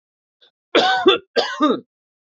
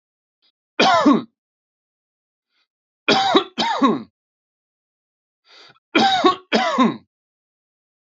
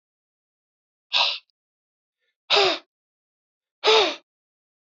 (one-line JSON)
{"cough_length": "2.4 s", "cough_amplitude": 24130, "cough_signal_mean_std_ratio": 0.46, "three_cough_length": "8.2 s", "three_cough_amplitude": 27009, "three_cough_signal_mean_std_ratio": 0.4, "exhalation_length": "4.9 s", "exhalation_amplitude": 21932, "exhalation_signal_mean_std_ratio": 0.31, "survey_phase": "beta (2021-08-13 to 2022-03-07)", "age": "18-44", "gender": "Male", "wearing_mask": "No", "symptom_none": true, "smoker_status": "Ex-smoker", "respiratory_condition_asthma": false, "respiratory_condition_other": false, "recruitment_source": "REACT", "submission_delay": "2 days", "covid_test_result": "Negative", "covid_test_method": "RT-qPCR", "influenza_a_test_result": "Negative", "influenza_b_test_result": "Negative"}